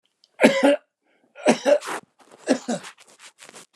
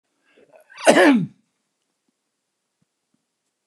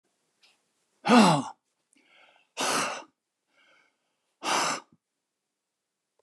{
  "three_cough_length": "3.8 s",
  "three_cough_amplitude": 29204,
  "three_cough_signal_mean_std_ratio": 0.38,
  "cough_length": "3.7 s",
  "cough_amplitude": 29204,
  "cough_signal_mean_std_ratio": 0.26,
  "exhalation_length": "6.2 s",
  "exhalation_amplitude": 15704,
  "exhalation_signal_mean_std_ratio": 0.3,
  "survey_phase": "beta (2021-08-13 to 2022-03-07)",
  "age": "65+",
  "gender": "Male",
  "wearing_mask": "No",
  "symptom_sore_throat": true,
  "smoker_status": "Ex-smoker",
  "respiratory_condition_asthma": false,
  "respiratory_condition_other": false,
  "recruitment_source": "REACT",
  "submission_delay": "1 day",
  "covid_test_result": "Negative",
  "covid_test_method": "RT-qPCR"
}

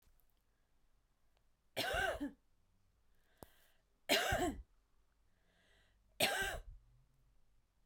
{
  "three_cough_length": "7.9 s",
  "three_cough_amplitude": 4219,
  "three_cough_signal_mean_std_ratio": 0.36,
  "survey_phase": "beta (2021-08-13 to 2022-03-07)",
  "age": "18-44",
  "gender": "Female",
  "wearing_mask": "No",
  "symptom_none": true,
  "smoker_status": "Never smoked",
  "respiratory_condition_asthma": false,
  "respiratory_condition_other": false,
  "recruitment_source": "REACT",
  "submission_delay": "2 days",
  "covid_test_result": "Negative",
  "covid_test_method": "RT-qPCR"
}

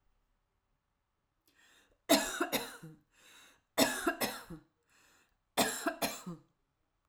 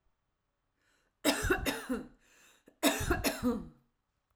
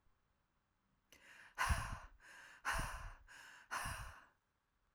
{
  "three_cough_length": "7.1 s",
  "three_cough_amplitude": 7527,
  "three_cough_signal_mean_std_ratio": 0.35,
  "cough_length": "4.4 s",
  "cough_amplitude": 8353,
  "cough_signal_mean_std_ratio": 0.46,
  "exhalation_length": "4.9 s",
  "exhalation_amplitude": 2067,
  "exhalation_signal_mean_std_ratio": 0.44,
  "survey_phase": "alpha (2021-03-01 to 2021-08-12)",
  "age": "18-44",
  "gender": "Female",
  "wearing_mask": "No",
  "symptom_none": true,
  "smoker_status": "Never smoked",
  "respiratory_condition_asthma": false,
  "respiratory_condition_other": false,
  "recruitment_source": "REACT",
  "submission_delay": "1 day",
  "covid_test_result": "Negative",
  "covid_test_method": "RT-qPCR"
}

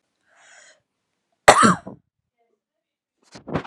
{
  "cough_length": "3.7 s",
  "cough_amplitude": 32768,
  "cough_signal_mean_std_ratio": 0.23,
  "survey_phase": "alpha (2021-03-01 to 2021-08-12)",
  "age": "18-44",
  "gender": "Female",
  "wearing_mask": "No",
  "symptom_fatigue": true,
  "symptom_headache": true,
  "smoker_status": "Never smoked",
  "respiratory_condition_asthma": false,
  "respiratory_condition_other": false,
  "recruitment_source": "REACT",
  "submission_delay": "2 days",
  "covid_test_result": "Negative",
  "covid_test_method": "RT-qPCR"
}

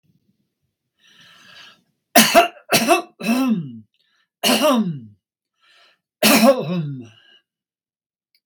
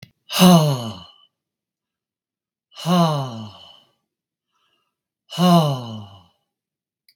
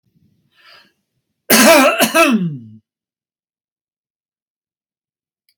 {
  "three_cough_length": "8.5 s",
  "three_cough_amplitude": 32768,
  "three_cough_signal_mean_std_ratio": 0.41,
  "exhalation_length": "7.2 s",
  "exhalation_amplitude": 32767,
  "exhalation_signal_mean_std_ratio": 0.36,
  "cough_length": "5.6 s",
  "cough_amplitude": 32768,
  "cough_signal_mean_std_ratio": 0.35,
  "survey_phase": "beta (2021-08-13 to 2022-03-07)",
  "age": "65+",
  "gender": "Male",
  "wearing_mask": "No",
  "symptom_none": true,
  "smoker_status": "Never smoked",
  "respiratory_condition_asthma": false,
  "respiratory_condition_other": false,
  "recruitment_source": "REACT",
  "submission_delay": "2 days",
  "covid_test_result": "Negative",
  "covid_test_method": "RT-qPCR"
}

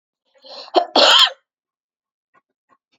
{
  "cough_length": "3.0 s",
  "cough_amplitude": 29362,
  "cough_signal_mean_std_ratio": 0.32,
  "survey_phase": "beta (2021-08-13 to 2022-03-07)",
  "age": "45-64",
  "gender": "Female",
  "wearing_mask": "No",
  "symptom_cough_any": true,
  "symptom_runny_or_blocked_nose": true,
  "symptom_headache": true,
  "symptom_onset": "6 days",
  "smoker_status": "Never smoked",
  "respiratory_condition_asthma": false,
  "respiratory_condition_other": false,
  "recruitment_source": "Test and Trace",
  "submission_delay": "2 days",
  "covid_test_result": "Positive",
  "covid_test_method": "RT-qPCR",
  "covid_ct_value": 24.2,
  "covid_ct_gene": "N gene"
}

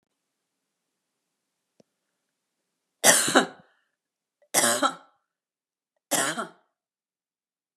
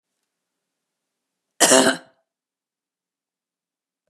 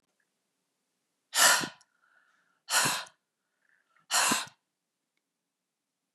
{
  "three_cough_length": "7.8 s",
  "three_cough_amplitude": 29747,
  "three_cough_signal_mean_std_ratio": 0.27,
  "cough_length": "4.1 s",
  "cough_amplitude": 32245,
  "cough_signal_mean_std_ratio": 0.22,
  "exhalation_length": "6.1 s",
  "exhalation_amplitude": 15031,
  "exhalation_signal_mean_std_ratio": 0.3,
  "survey_phase": "beta (2021-08-13 to 2022-03-07)",
  "age": "45-64",
  "gender": "Female",
  "wearing_mask": "No",
  "symptom_none": true,
  "symptom_onset": "4 days",
  "smoker_status": "Never smoked",
  "respiratory_condition_asthma": false,
  "respiratory_condition_other": false,
  "recruitment_source": "REACT",
  "submission_delay": "0 days",
  "covid_test_result": "Negative",
  "covid_test_method": "RT-qPCR",
  "influenza_a_test_result": "Negative",
  "influenza_b_test_result": "Negative"
}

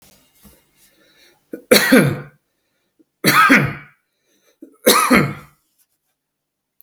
{
  "three_cough_length": "6.8 s",
  "three_cough_amplitude": 32768,
  "three_cough_signal_mean_std_ratio": 0.36,
  "survey_phase": "beta (2021-08-13 to 2022-03-07)",
  "age": "45-64",
  "gender": "Male",
  "wearing_mask": "No",
  "symptom_sore_throat": true,
  "symptom_fatigue": true,
  "symptom_headache": true,
  "symptom_onset": "5 days",
  "smoker_status": "Ex-smoker",
  "respiratory_condition_asthma": false,
  "respiratory_condition_other": false,
  "recruitment_source": "REACT",
  "submission_delay": "0 days",
  "covid_test_result": "Positive",
  "covid_test_method": "RT-qPCR",
  "covid_ct_value": 27.2,
  "covid_ct_gene": "E gene",
  "influenza_a_test_result": "Negative",
  "influenza_b_test_result": "Negative"
}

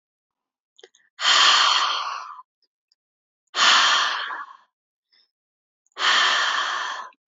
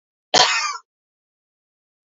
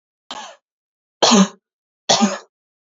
{
  "exhalation_length": "7.3 s",
  "exhalation_amplitude": 21983,
  "exhalation_signal_mean_std_ratio": 0.51,
  "cough_length": "2.1 s",
  "cough_amplitude": 30297,
  "cough_signal_mean_std_ratio": 0.31,
  "three_cough_length": "3.0 s",
  "three_cough_amplitude": 30175,
  "three_cough_signal_mean_std_ratio": 0.34,
  "survey_phase": "beta (2021-08-13 to 2022-03-07)",
  "age": "18-44",
  "gender": "Female",
  "wearing_mask": "No",
  "symptom_sore_throat": true,
  "smoker_status": "Never smoked",
  "respiratory_condition_asthma": false,
  "respiratory_condition_other": false,
  "recruitment_source": "Test and Trace",
  "submission_delay": "2 days",
  "covid_test_result": "Positive",
  "covid_test_method": "RT-qPCR",
  "covid_ct_value": 26.0,
  "covid_ct_gene": "ORF1ab gene",
  "covid_ct_mean": 26.4,
  "covid_viral_load": "2200 copies/ml",
  "covid_viral_load_category": "Minimal viral load (< 10K copies/ml)"
}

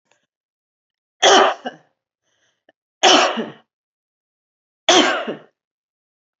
{
  "three_cough_length": "6.4 s",
  "three_cough_amplitude": 30968,
  "three_cough_signal_mean_std_ratio": 0.32,
  "survey_phase": "beta (2021-08-13 to 2022-03-07)",
  "age": "45-64",
  "gender": "Female",
  "wearing_mask": "No",
  "symptom_none": true,
  "smoker_status": "Never smoked",
  "respiratory_condition_asthma": false,
  "respiratory_condition_other": false,
  "recruitment_source": "Test and Trace",
  "submission_delay": "0 days",
  "covid_test_result": "Negative",
  "covid_test_method": "LFT"
}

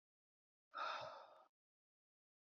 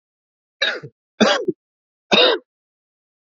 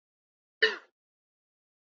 {
  "exhalation_length": "2.5 s",
  "exhalation_amplitude": 618,
  "exhalation_signal_mean_std_ratio": 0.37,
  "three_cough_length": "3.3 s",
  "three_cough_amplitude": 27562,
  "three_cough_signal_mean_std_ratio": 0.35,
  "cough_length": "2.0 s",
  "cough_amplitude": 9980,
  "cough_signal_mean_std_ratio": 0.17,
  "survey_phase": "beta (2021-08-13 to 2022-03-07)",
  "age": "18-44",
  "gender": "Male",
  "wearing_mask": "No",
  "symptom_runny_or_blocked_nose": true,
  "symptom_shortness_of_breath": true,
  "symptom_fatigue": true,
  "symptom_headache": true,
  "symptom_change_to_sense_of_smell_or_taste": true,
  "symptom_onset": "3 days",
  "smoker_status": "Never smoked",
  "respiratory_condition_asthma": false,
  "respiratory_condition_other": false,
  "recruitment_source": "Test and Trace",
  "submission_delay": "2 days",
  "covid_test_result": "Positive",
  "covid_test_method": "RT-qPCR",
  "covid_ct_value": 15.0,
  "covid_ct_gene": "ORF1ab gene",
  "covid_ct_mean": 15.2,
  "covid_viral_load": "10000000 copies/ml",
  "covid_viral_load_category": "High viral load (>1M copies/ml)"
}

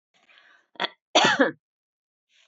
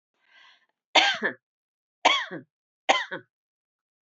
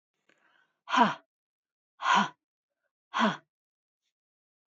{
  "cough_length": "2.5 s",
  "cough_amplitude": 19869,
  "cough_signal_mean_std_ratio": 0.31,
  "three_cough_length": "4.0 s",
  "three_cough_amplitude": 20740,
  "three_cough_signal_mean_std_ratio": 0.31,
  "exhalation_length": "4.7 s",
  "exhalation_amplitude": 11452,
  "exhalation_signal_mean_std_ratio": 0.29,
  "survey_phase": "beta (2021-08-13 to 2022-03-07)",
  "age": "45-64",
  "gender": "Female",
  "wearing_mask": "No",
  "symptom_none": true,
  "smoker_status": "Never smoked",
  "respiratory_condition_asthma": false,
  "respiratory_condition_other": false,
  "recruitment_source": "REACT",
  "submission_delay": "1 day",
  "covid_test_result": "Negative",
  "covid_test_method": "RT-qPCR",
  "influenza_a_test_result": "Negative",
  "influenza_b_test_result": "Negative"
}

